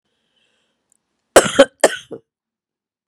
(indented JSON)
{
  "cough_length": "3.1 s",
  "cough_amplitude": 32768,
  "cough_signal_mean_std_ratio": 0.22,
  "survey_phase": "beta (2021-08-13 to 2022-03-07)",
  "age": "45-64",
  "gender": "Female",
  "wearing_mask": "No",
  "symptom_cough_any": true,
  "symptom_runny_or_blocked_nose": true,
  "symptom_sore_throat": true,
  "symptom_headache": true,
  "symptom_loss_of_taste": true,
  "symptom_other": true,
  "symptom_onset": "4 days",
  "smoker_status": "Ex-smoker",
  "respiratory_condition_asthma": false,
  "respiratory_condition_other": false,
  "recruitment_source": "Test and Trace",
  "submission_delay": "1 day",
  "covid_test_result": "Positive",
  "covid_test_method": "RT-qPCR",
  "covid_ct_value": 29.5,
  "covid_ct_gene": "N gene"
}